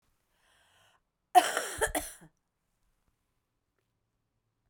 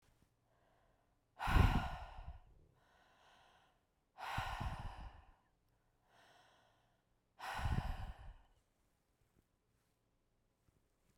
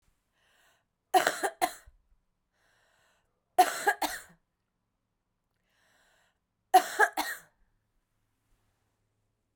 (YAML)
cough_length: 4.7 s
cough_amplitude: 13183
cough_signal_mean_std_ratio: 0.21
exhalation_length: 11.2 s
exhalation_amplitude: 3637
exhalation_signal_mean_std_ratio: 0.31
three_cough_length: 9.6 s
three_cough_amplitude: 15356
three_cough_signal_mean_std_ratio: 0.23
survey_phase: beta (2021-08-13 to 2022-03-07)
age: 45-64
gender: Female
wearing_mask: 'No'
symptom_runny_or_blocked_nose: true
symptom_fatigue: true
symptom_change_to_sense_of_smell_or_taste: true
symptom_loss_of_taste: true
smoker_status: Never smoked
respiratory_condition_asthma: false
respiratory_condition_other: false
recruitment_source: Test and Trace
submission_delay: 2 days
covid_test_result: Positive
covid_test_method: RT-qPCR
covid_ct_value: 30.8
covid_ct_gene: ORF1ab gene
covid_ct_mean: 31.5
covid_viral_load: 48 copies/ml
covid_viral_load_category: Minimal viral load (< 10K copies/ml)